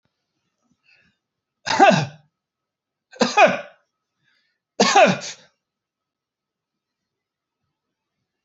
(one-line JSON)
{"three_cough_length": "8.4 s", "three_cough_amplitude": 27905, "three_cough_signal_mean_std_ratio": 0.27, "survey_phase": "beta (2021-08-13 to 2022-03-07)", "age": "45-64", "gender": "Male", "wearing_mask": "No", "symptom_none": true, "smoker_status": "Never smoked", "respiratory_condition_asthma": false, "respiratory_condition_other": false, "recruitment_source": "REACT", "submission_delay": "3 days", "covid_test_result": "Negative", "covid_test_method": "RT-qPCR", "influenza_a_test_result": "Unknown/Void", "influenza_b_test_result": "Unknown/Void"}